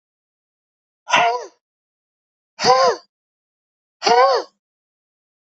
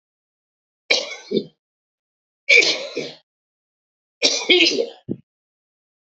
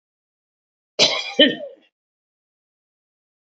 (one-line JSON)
{"exhalation_length": "5.5 s", "exhalation_amplitude": 28542, "exhalation_signal_mean_std_ratio": 0.34, "three_cough_length": "6.1 s", "three_cough_amplitude": 32768, "three_cough_signal_mean_std_ratio": 0.35, "cough_length": "3.6 s", "cough_amplitude": 29821, "cough_signal_mean_std_ratio": 0.26, "survey_phase": "beta (2021-08-13 to 2022-03-07)", "age": "65+", "gender": "Male", "wearing_mask": "No", "symptom_none": true, "smoker_status": "Never smoked", "respiratory_condition_asthma": false, "respiratory_condition_other": false, "recruitment_source": "REACT", "submission_delay": "1 day", "covid_test_result": "Negative", "covid_test_method": "RT-qPCR", "influenza_a_test_result": "Negative", "influenza_b_test_result": "Negative"}